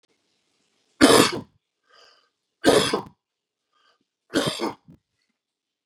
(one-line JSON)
{"three_cough_length": "5.9 s", "three_cough_amplitude": 31404, "three_cough_signal_mean_std_ratio": 0.29, "survey_phase": "beta (2021-08-13 to 2022-03-07)", "age": "45-64", "gender": "Male", "wearing_mask": "No", "symptom_none": true, "smoker_status": "Never smoked", "respiratory_condition_asthma": false, "respiratory_condition_other": false, "recruitment_source": "REACT", "submission_delay": "2 days", "covid_test_result": "Negative", "covid_test_method": "RT-qPCR", "influenza_a_test_result": "Negative", "influenza_b_test_result": "Negative"}